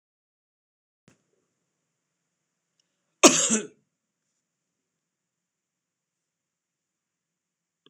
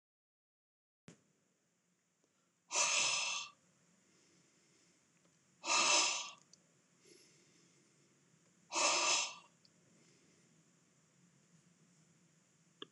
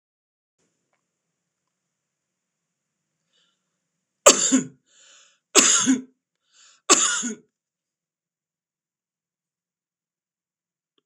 cough_length: 7.9 s
cough_amplitude: 26028
cough_signal_mean_std_ratio: 0.14
exhalation_length: 12.9 s
exhalation_amplitude: 3541
exhalation_signal_mean_std_ratio: 0.33
three_cough_length: 11.1 s
three_cough_amplitude: 26028
three_cough_signal_mean_std_ratio: 0.23
survey_phase: beta (2021-08-13 to 2022-03-07)
age: 65+
gender: Male
wearing_mask: 'No'
symptom_none: true
smoker_status: Ex-smoker
respiratory_condition_asthma: false
respiratory_condition_other: false
recruitment_source: REACT
submission_delay: 2 days
covid_test_result: Negative
covid_test_method: RT-qPCR
influenza_a_test_result: Negative
influenza_b_test_result: Negative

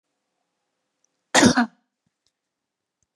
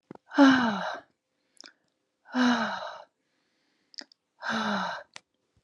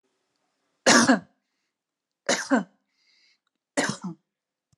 cough_length: 3.2 s
cough_amplitude: 25808
cough_signal_mean_std_ratio: 0.23
exhalation_length: 5.6 s
exhalation_amplitude: 15802
exhalation_signal_mean_std_ratio: 0.39
three_cough_length: 4.8 s
three_cough_amplitude: 21362
three_cough_signal_mean_std_ratio: 0.3
survey_phase: beta (2021-08-13 to 2022-03-07)
age: 45-64
gender: Female
wearing_mask: 'No'
symptom_none: true
smoker_status: Never smoked
respiratory_condition_asthma: false
respiratory_condition_other: false
recruitment_source: REACT
submission_delay: 3 days
covid_test_result: Negative
covid_test_method: RT-qPCR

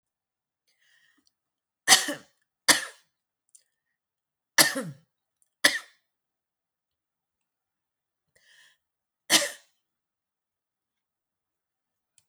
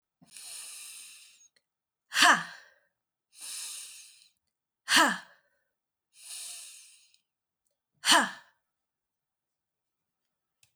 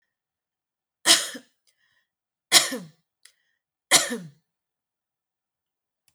cough_length: 12.3 s
cough_amplitude: 27829
cough_signal_mean_std_ratio: 0.18
exhalation_length: 10.8 s
exhalation_amplitude: 15905
exhalation_signal_mean_std_ratio: 0.26
three_cough_length: 6.1 s
three_cough_amplitude: 31089
three_cough_signal_mean_std_ratio: 0.23
survey_phase: alpha (2021-03-01 to 2021-08-12)
age: 45-64
gender: Female
wearing_mask: 'No'
symptom_cough_any: true
symptom_onset: 13 days
smoker_status: Never smoked
respiratory_condition_asthma: false
respiratory_condition_other: false
recruitment_source: REACT
submission_delay: 3 days
covid_test_result: Negative
covid_test_method: RT-qPCR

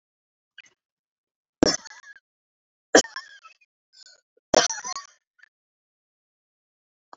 three_cough_length: 7.2 s
three_cough_amplitude: 28534
three_cough_signal_mean_std_ratio: 0.18
survey_phase: beta (2021-08-13 to 2022-03-07)
age: 65+
gender: Female
wearing_mask: 'No'
symptom_none: true
smoker_status: Never smoked
respiratory_condition_asthma: false
respiratory_condition_other: false
recruitment_source: REACT
submission_delay: 3 days
covid_test_result: Negative
covid_test_method: RT-qPCR
influenza_a_test_result: Negative
influenza_b_test_result: Negative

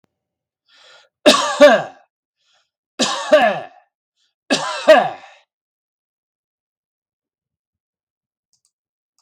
three_cough_length: 9.2 s
three_cough_amplitude: 32768
three_cough_signal_mean_std_ratio: 0.29
survey_phase: beta (2021-08-13 to 2022-03-07)
age: 65+
gender: Male
wearing_mask: 'No'
symptom_none: true
smoker_status: Never smoked
respiratory_condition_asthma: false
respiratory_condition_other: false
recruitment_source: REACT
submission_delay: 0 days
covid_test_result: Negative
covid_test_method: RT-qPCR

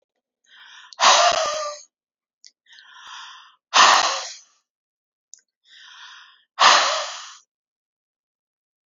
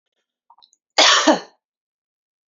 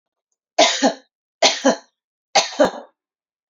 exhalation_length: 8.9 s
exhalation_amplitude: 29181
exhalation_signal_mean_std_ratio: 0.34
cough_length: 2.5 s
cough_amplitude: 29397
cough_signal_mean_std_ratio: 0.32
three_cough_length: 3.5 s
three_cough_amplitude: 32768
three_cough_signal_mean_std_ratio: 0.38
survey_phase: beta (2021-08-13 to 2022-03-07)
age: 18-44
gender: Female
wearing_mask: 'No'
symptom_none: true
smoker_status: Never smoked
respiratory_condition_asthma: false
respiratory_condition_other: false
recruitment_source: REACT
submission_delay: 2 days
covid_test_result: Negative
covid_test_method: RT-qPCR
influenza_a_test_result: Negative
influenza_b_test_result: Negative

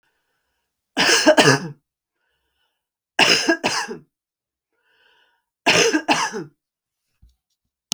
three_cough_length: 7.9 s
three_cough_amplitude: 32768
three_cough_signal_mean_std_ratio: 0.37
survey_phase: beta (2021-08-13 to 2022-03-07)
age: 45-64
gender: Female
wearing_mask: 'No'
symptom_none: true
smoker_status: Ex-smoker
respiratory_condition_asthma: false
respiratory_condition_other: false
recruitment_source: REACT
submission_delay: 2 days
covid_test_result: Negative
covid_test_method: RT-qPCR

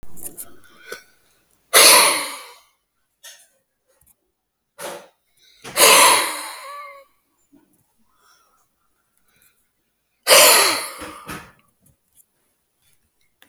exhalation_length: 13.5 s
exhalation_amplitude: 32768
exhalation_signal_mean_std_ratio: 0.31
survey_phase: beta (2021-08-13 to 2022-03-07)
age: 45-64
gender: Male
wearing_mask: 'No'
symptom_cough_any: true
symptom_other: true
smoker_status: Current smoker (11 or more cigarettes per day)
respiratory_condition_asthma: false
respiratory_condition_other: false
recruitment_source: REACT
submission_delay: 1 day
covid_test_result: Negative
covid_test_method: RT-qPCR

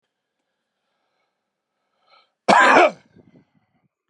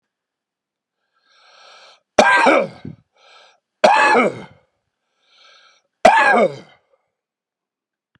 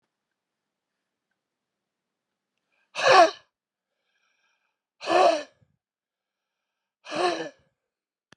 cough_length: 4.1 s
cough_amplitude: 31331
cough_signal_mean_std_ratio: 0.26
three_cough_length: 8.2 s
three_cough_amplitude: 32768
three_cough_signal_mean_std_ratio: 0.35
exhalation_length: 8.4 s
exhalation_amplitude: 21206
exhalation_signal_mean_std_ratio: 0.25
survey_phase: beta (2021-08-13 to 2022-03-07)
age: 65+
gender: Male
wearing_mask: 'No'
symptom_runny_or_blocked_nose: true
symptom_sore_throat: true
symptom_onset: 4 days
smoker_status: Never smoked
respiratory_condition_asthma: true
respiratory_condition_other: false
recruitment_source: Test and Trace
submission_delay: 1 day
covid_test_result: Positive
covid_test_method: ePCR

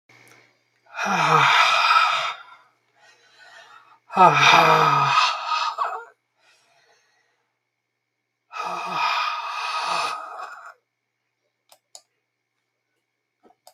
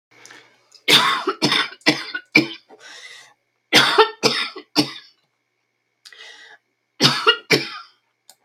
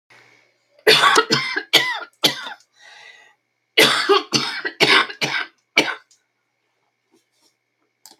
exhalation_length: 13.7 s
exhalation_amplitude: 31817
exhalation_signal_mean_std_ratio: 0.45
three_cough_length: 8.4 s
three_cough_amplitude: 32768
three_cough_signal_mean_std_ratio: 0.39
cough_length: 8.2 s
cough_amplitude: 32768
cough_signal_mean_std_ratio: 0.41
survey_phase: beta (2021-08-13 to 2022-03-07)
age: 65+
gender: Female
wearing_mask: 'No'
symptom_none: true
symptom_onset: 6 days
smoker_status: Never smoked
respiratory_condition_asthma: false
respiratory_condition_other: false
recruitment_source: REACT
submission_delay: 3 days
covid_test_result: Negative
covid_test_method: RT-qPCR
influenza_a_test_result: Negative
influenza_b_test_result: Negative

